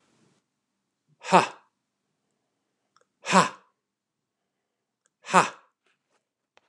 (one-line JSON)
{"exhalation_length": "6.7 s", "exhalation_amplitude": 27727, "exhalation_signal_mean_std_ratio": 0.19, "survey_phase": "beta (2021-08-13 to 2022-03-07)", "age": "45-64", "gender": "Male", "wearing_mask": "No", "symptom_none": true, "smoker_status": "Never smoked", "respiratory_condition_asthma": false, "respiratory_condition_other": false, "recruitment_source": "REACT", "submission_delay": "2 days", "covid_test_result": "Negative", "covid_test_method": "RT-qPCR", "influenza_a_test_result": "Negative", "influenza_b_test_result": "Negative"}